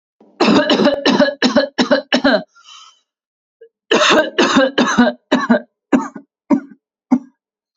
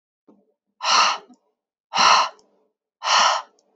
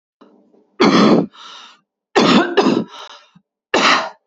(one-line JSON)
{"cough_length": "7.8 s", "cough_amplitude": 29487, "cough_signal_mean_std_ratio": 0.55, "exhalation_length": "3.8 s", "exhalation_amplitude": 26622, "exhalation_signal_mean_std_ratio": 0.44, "three_cough_length": "4.3 s", "three_cough_amplitude": 31106, "three_cough_signal_mean_std_ratio": 0.5, "survey_phase": "beta (2021-08-13 to 2022-03-07)", "age": "18-44", "gender": "Female", "wearing_mask": "No", "symptom_cough_any": true, "smoker_status": "Ex-smoker", "respiratory_condition_asthma": false, "respiratory_condition_other": false, "recruitment_source": "REACT", "submission_delay": "2 days", "covid_test_result": "Negative", "covid_test_method": "RT-qPCR"}